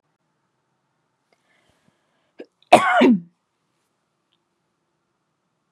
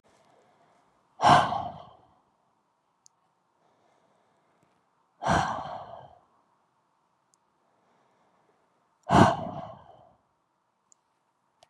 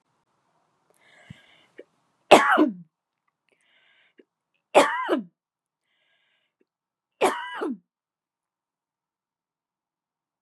{"cough_length": "5.7 s", "cough_amplitude": 32768, "cough_signal_mean_std_ratio": 0.22, "exhalation_length": "11.7 s", "exhalation_amplitude": 18943, "exhalation_signal_mean_std_ratio": 0.24, "three_cough_length": "10.4 s", "three_cough_amplitude": 32767, "three_cough_signal_mean_std_ratio": 0.23, "survey_phase": "beta (2021-08-13 to 2022-03-07)", "age": "18-44", "gender": "Female", "wearing_mask": "No", "symptom_none": true, "symptom_onset": "6 days", "smoker_status": "Never smoked", "respiratory_condition_asthma": false, "respiratory_condition_other": false, "recruitment_source": "REACT", "submission_delay": "1 day", "covid_test_result": "Negative", "covid_test_method": "RT-qPCR", "influenza_a_test_result": "Negative", "influenza_b_test_result": "Negative"}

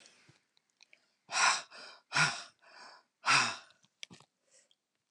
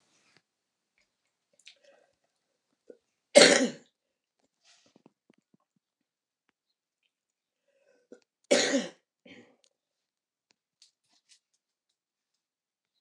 {"exhalation_length": "5.1 s", "exhalation_amplitude": 7765, "exhalation_signal_mean_std_ratio": 0.33, "cough_length": "13.0 s", "cough_amplitude": 25324, "cough_signal_mean_std_ratio": 0.16, "survey_phase": "alpha (2021-03-01 to 2021-08-12)", "age": "65+", "gender": "Female", "wearing_mask": "No", "symptom_cough_any": true, "smoker_status": "Current smoker (11 or more cigarettes per day)", "respiratory_condition_asthma": false, "respiratory_condition_other": false, "recruitment_source": "REACT", "submission_delay": "2 days", "covid_test_result": "Negative", "covid_test_method": "RT-qPCR"}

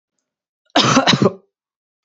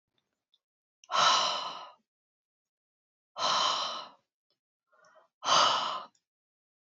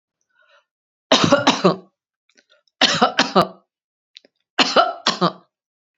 {"cough_length": "2.0 s", "cough_amplitude": 31823, "cough_signal_mean_std_ratio": 0.4, "exhalation_length": "6.9 s", "exhalation_amplitude": 9747, "exhalation_signal_mean_std_ratio": 0.4, "three_cough_length": "6.0 s", "three_cough_amplitude": 32767, "three_cough_signal_mean_std_ratio": 0.38, "survey_phase": "beta (2021-08-13 to 2022-03-07)", "age": "45-64", "gender": "Female", "wearing_mask": "No", "symptom_none": true, "symptom_onset": "2 days", "smoker_status": "Never smoked", "respiratory_condition_asthma": false, "respiratory_condition_other": false, "recruitment_source": "REACT", "submission_delay": "1 day", "covid_test_result": "Negative", "covid_test_method": "RT-qPCR"}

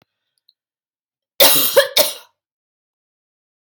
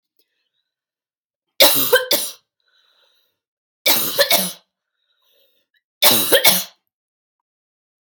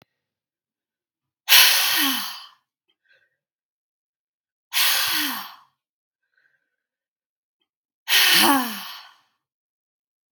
{"cough_length": "3.7 s", "cough_amplitude": 32768, "cough_signal_mean_std_ratio": 0.31, "three_cough_length": "8.1 s", "three_cough_amplitude": 32768, "three_cough_signal_mean_std_ratio": 0.35, "exhalation_length": "10.3 s", "exhalation_amplitude": 32768, "exhalation_signal_mean_std_ratio": 0.35, "survey_phase": "beta (2021-08-13 to 2022-03-07)", "age": "18-44", "gender": "Female", "wearing_mask": "No", "symptom_none": true, "symptom_onset": "3 days", "smoker_status": "Never smoked", "respiratory_condition_asthma": true, "respiratory_condition_other": false, "recruitment_source": "REACT", "submission_delay": "2 days", "covid_test_result": "Negative", "covid_test_method": "RT-qPCR", "influenza_a_test_result": "Unknown/Void", "influenza_b_test_result": "Unknown/Void"}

